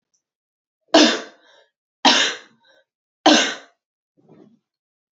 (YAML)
three_cough_length: 5.1 s
three_cough_amplitude: 29207
three_cough_signal_mean_std_ratio: 0.3
survey_phase: beta (2021-08-13 to 2022-03-07)
age: 18-44
gender: Female
wearing_mask: 'No'
symptom_cough_any: true
symptom_runny_or_blocked_nose: true
symptom_sore_throat: true
smoker_status: Never smoked
respiratory_condition_asthma: false
respiratory_condition_other: false
recruitment_source: Test and Trace
submission_delay: 0 days
covid_test_result: Positive
covid_test_method: LFT